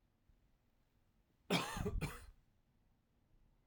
{"cough_length": "3.7 s", "cough_amplitude": 2808, "cough_signal_mean_std_ratio": 0.34, "survey_phase": "alpha (2021-03-01 to 2021-08-12)", "age": "18-44", "gender": "Male", "wearing_mask": "No", "symptom_cough_any": true, "symptom_fatigue": true, "symptom_headache": true, "symptom_onset": "2 days", "smoker_status": "Current smoker (11 or more cigarettes per day)", "respiratory_condition_asthma": false, "respiratory_condition_other": false, "recruitment_source": "Test and Trace", "submission_delay": "1 day", "covid_test_result": "Positive", "covid_test_method": "RT-qPCR", "covid_ct_value": 16.1, "covid_ct_gene": "ORF1ab gene", "covid_ct_mean": 16.5, "covid_viral_load": "3700000 copies/ml", "covid_viral_load_category": "High viral load (>1M copies/ml)"}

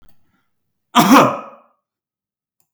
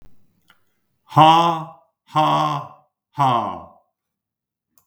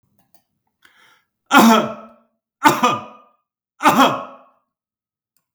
{"cough_length": "2.7 s", "cough_amplitude": 32768, "cough_signal_mean_std_ratio": 0.31, "exhalation_length": "4.9 s", "exhalation_amplitude": 32768, "exhalation_signal_mean_std_ratio": 0.39, "three_cough_length": "5.5 s", "three_cough_amplitude": 32768, "three_cough_signal_mean_std_ratio": 0.35, "survey_phase": "beta (2021-08-13 to 2022-03-07)", "age": "45-64", "gender": "Male", "wearing_mask": "No", "symptom_change_to_sense_of_smell_or_taste": true, "smoker_status": "Never smoked", "respiratory_condition_asthma": false, "respiratory_condition_other": false, "recruitment_source": "REACT", "submission_delay": "2 days", "covid_test_result": "Negative", "covid_test_method": "RT-qPCR", "influenza_a_test_result": "Negative", "influenza_b_test_result": "Negative"}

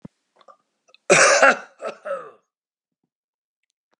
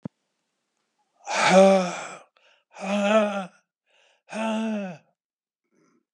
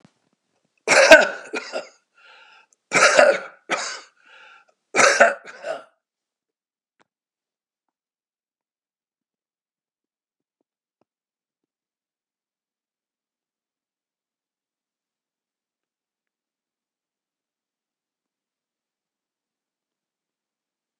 {"cough_length": "4.0 s", "cough_amplitude": 31027, "cough_signal_mean_std_ratio": 0.31, "exhalation_length": "6.1 s", "exhalation_amplitude": 24569, "exhalation_signal_mean_std_ratio": 0.41, "three_cough_length": "21.0 s", "three_cough_amplitude": 32768, "three_cough_signal_mean_std_ratio": 0.2, "survey_phase": "alpha (2021-03-01 to 2021-08-12)", "age": "65+", "gender": "Male", "wearing_mask": "No", "symptom_shortness_of_breath": true, "smoker_status": "Ex-smoker", "respiratory_condition_asthma": false, "respiratory_condition_other": false, "recruitment_source": "REACT", "submission_delay": "1 day", "covid_test_result": "Negative", "covid_test_method": "RT-qPCR"}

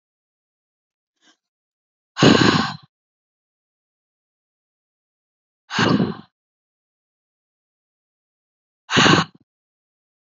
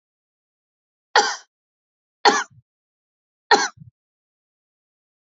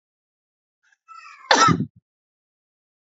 {"exhalation_length": "10.3 s", "exhalation_amplitude": 27879, "exhalation_signal_mean_std_ratio": 0.26, "three_cough_length": "5.4 s", "three_cough_amplitude": 30187, "three_cough_signal_mean_std_ratio": 0.22, "cough_length": "3.2 s", "cough_amplitude": 30161, "cough_signal_mean_std_ratio": 0.26, "survey_phase": "alpha (2021-03-01 to 2021-08-12)", "age": "18-44", "gender": "Female", "wearing_mask": "No", "symptom_cough_any": true, "symptom_fatigue": true, "smoker_status": "Never smoked", "respiratory_condition_asthma": false, "respiratory_condition_other": false, "recruitment_source": "Test and Trace", "submission_delay": "2 days", "covid_test_result": "Positive", "covid_test_method": "RT-qPCR"}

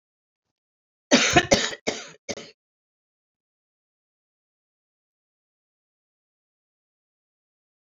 {"cough_length": "7.9 s", "cough_amplitude": 27952, "cough_signal_mean_std_ratio": 0.2, "survey_phase": "alpha (2021-03-01 to 2021-08-12)", "age": "65+", "gender": "Female", "wearing_mask": "No", "symptom_none": true, "smoker_status": "Ex-smoker", "respiratory_condition_asthma": false, "respiratory_condition_other": false, "recruitment_source": "REACT", "submission_delay": "1 day", "covid_test_result": "Negative", "covid_test_method": "RT-qPCR"}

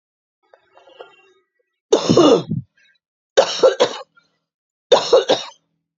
{"three_cough_length": "6.0 s", "three_cough_amplitude": 29723, "three_cough_signal_mean_std_ratio": 0.37, "survey_phase": "beta (2021-08-13 to 2022-03-07)", "age": "45-64", "gender": "Female", "wearing_mask": "No", "symptom_fatigue": true, "symptom_headache": true, "symptom_onset": "11 days", "smoker_status": "Never smoked", "respiratory_condition_asthma": false, "respiratory_condition_other": true, "recruitment_source": "REACT", "submission_delay": "1 day", "covid_test_result": "Negative", "covid_test_method": "RT-qPCR", "influenza_a_test_result": "Negative", "influenza_b_test_result": "Negative"}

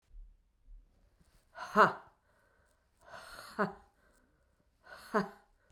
{"exhalation_length": "5.7 s", "exhalation_amplitude": 10044, "exhalation_signal_mean_std_ratio": 0.24, "survey_phase": "beta (2021-08-13 to 2022-03-07)", "age": "45-64", "gender": "Female", "wearing_mask": "No", "symptom_cough_any": true, "symptom_runny_or_blocked_nose": true, "symptom_sore_throat": true, "symptom_fatigue": true, "symptom_fever_high_temperature": true, "symptom_change_to_sense_of_smell_or_taste": true, "symptom_loss_of_taste": true, "symptom_other": true, "symptom_onset": "4 days", "smoker_status": "Ex-smoker", "respiratory_condition_asthma": false, "respiratory_condition_other": false, "recruitment_source": "Test and Trace", "submission_delay": "2 days", "covid_test_result": "Positive", "covid_test_method": "RT-qPCR", "covid_ct_value": 20.7, "covid_ct_gene": "ORF1ab gene", "covid_ct_mean": 21.0, "covid_viral_load": "130000 copies/ml", "covid_viral_load_category": "Low viral load (10K-1M copies/ml)"}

